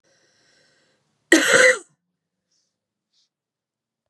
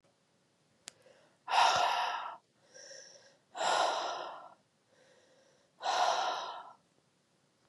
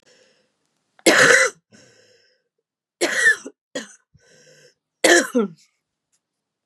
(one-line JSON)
{"cough_length": "4.1 s", "cough_amplitude": 32767, "cough_signal_mean_std_ratio": 0.26, "exhalation_length": "7.7 s", "exhalation_amplitude": 6960, "exhalation_signal_mean_std_ratio": 0.45, "three_cough_length": "6.7 s", "three_cough_amplitude": 32732, "three_cough_signal_mean_std_ratio": 0.33, "survey_phase": "beta (2021-08-13 to 2022-03-07)", "age": "45-64", "gender": "Female", "wearing_mask": "No", "symptom_cough_any": true, "symptom_runny_or_blocked_nose": true, "symptom_headache": true, "symptom_change_to_sense_of_smell_or_taste": true, "symptom_loss_of_taste": true, "symptom_onset": "4 days", "smoker_status": "Never smoked", "respiratory_condition_asthma": false, "respiratory_condition_other": false, "recruitment_source": "Test and Trace", "submission_delay": "1 day", "covid_test_result": "Positive", "covid_test_method": "LAMP"}